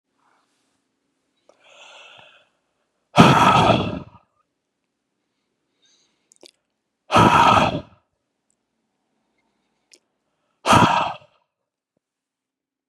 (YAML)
exhalation_length: 12.9 s
exhalation_amplitude: 32768
exhalation_signal_mean_std_ratio: 0.3
survey_phase: beta (2021-08-13 to 2022-03-07)
age: 45-64
gender: Male
wearing_mask: 'No'
symptom_none: true
smoker_status: Never smoked
respiratory_condition_asthma: false
respiratory_condition_other: false
recruitment_source: REACT
submission_delay: 2 days
covid_test_result: Negative
covid_test_method: RT-qPCR
influenza_a_test_result: Negative
influenza_b_test_result: Negative